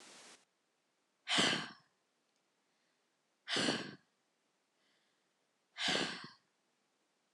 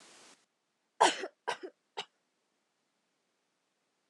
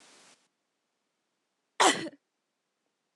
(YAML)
exhalation_length: 7.3 s
exhalation_amplitude: 3653
exhalation_signal_mean_std_ratio: 0.33
three_cough_length: 4.1 s
three_cough_amplitude: 10462
three_cough_signal_mean_std_ratio: 0.2
cough_length: 3.2 s
cough_amplitude: 14304
cough_signal_mean_std_ratio: 0.2
survey_phase: beta (2021-08-13 to 2022-03-07)
age: 18-44
gender: Female
wearing_mask: 'No'
symptom_none: true
smoker_status: Never smoked
respiratory_condition_asthma: false
respiratory_condition_other: false
recruitment_source: REACT
submission_delay: 2 days
covid_test_result: Negative
covid_test_method: RT-qPCR